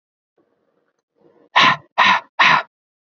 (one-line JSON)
{"exhalation_length": "3.2 s", "exhalation_amplitude": 28191, "exhalation_signal_mean_std_ratio": 0.37, "survey_phase": "beta (2021-08-13 to 2022-03-07)", "age": "18-44", "gender": "Male", "wearing_mask": "No", "symptom_none": true, "smoker_status": "Ex-smoker", "respiratory_condition_asthma": false, "respiratory_condition_other": false, "recruitment_source": "REACT", "submission_delay": "1 day", "covid_test_result": "Negative", "covid_test_method": "RT-qPCR", "influenza_a_test_result": "Negative", "influenza_b_test_result": "Negative"}